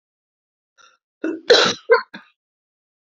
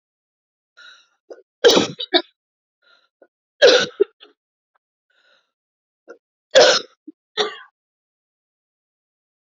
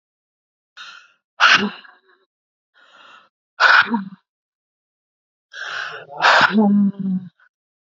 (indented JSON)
{
  "cough_length": "3.2 s",
  "cough_amplitude": 32681,
  "cough_signal_mean_std_ratio": 0.29,
  "three_cough_length": "9.6 s",
  "three_cough_amplitude": 32245,
  "three_cough_signal_mean_std_ratio": 0.25,
  "exhalation_length": "7.9 s",
  "exhalation_amplitude": 30140,
  "exhalation_signal_mean_std_ratio": 0.39,
  "survey_phase": "beta (2021-08-13 to 2022-03-07)",
  "age": "45-64",
  "gender": "Female",
  "wearing_mask": "No",
  "symptom_cough_any": true,
  "symptom_runny_or_blocked_nose": true,
  "symptom_shortness_of_breath": true,
  "symptom_sore_throat": true,
  "symptom_fatigue": true,
  "symptom_headache": true,
  "symptom_change_to_sense_of_smell_or_taste": true,
  "smoker_status": "Ex-smoker",
  "respiratory_condition_asthma": false,
  "respiratory_condition_other": false,
  "recruitment_source": "Test and Trace",
  "submission_delay": "1 day",
  "covid_test_result": "Positive",
  "covid_test_method": "LFT"
}